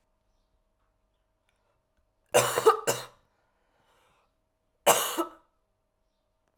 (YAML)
three_cough_length: 6.6 s
three_cough_amplitude: 19280
three_cough_signal_mean_std_ratio: 0.25
survey_phase: alpha (2021-03-01 to 2021-08-12)
age: 18-44
gender: Female
wearing_mask: 'No'
symptom_cough_any: true
symptom_new_continuous_cough: true
symptom_shortness_of_breath: true
symptom_fatigue: true
symptom_headache: true
smoker_status: Current smoker (1 to 10 cigarettes per day)
respiratory_condition_asthma: false
respiratory_condition_other: false
recruitment_source: Test and Trace
submission_delay: 1 day
covid_test_result: Positive
covid_test_method: RT-qPCR
covid_ct_value: 20.5
covid_ct_gene: ORF1ab gene
covid_ct_mean: 21.8
covid_viral_load: 73000 copies/ml
covid_viral_load_category: Low viral load (10K-1M copies/ml)